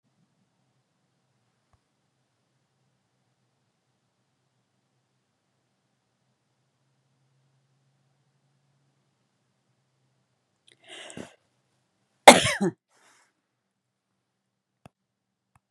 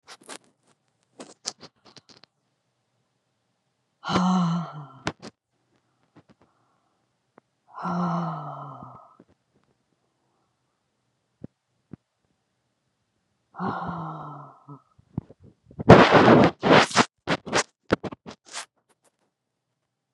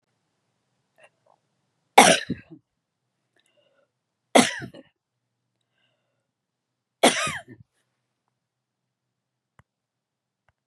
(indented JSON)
{
  "cough_length": "15.7 s",
  "cough_amplitude": 32768,
  "cough_signal_mean_std_ratio": 0.09,
  "exhalation_length": "20.1 s",
  "exhalation_amplitude": 32768,
  "exhalation_signal_mean_std_ratio": 0.27,
  "three_cough_length": "10.7 s",
  "three_cough_amplitude": 32768,
  "three_cough_signal_mean_std_ratio": 0.18,
  "survey_phase": "beta (2021-08-13 to 2022-03-07)",
  "age": "65+",
  "gender": "Female",
  "wearing_mask": "No",
  "symptom_none": true,
  "smoker_status": "Never smoked",
  "respiratory_condition_asthma": false,
  "respiratory_condition_other": false,
  "recruitment_source": "REACT",
  "submission_delay": "2 days",
  "covid_test_result": "Negative",
  "covid_test_method": "RT-qPCR",
  "influenza_a_test_result": "Unknown/Void",
  "influenza_b_test_result": "Unknown/Void"
}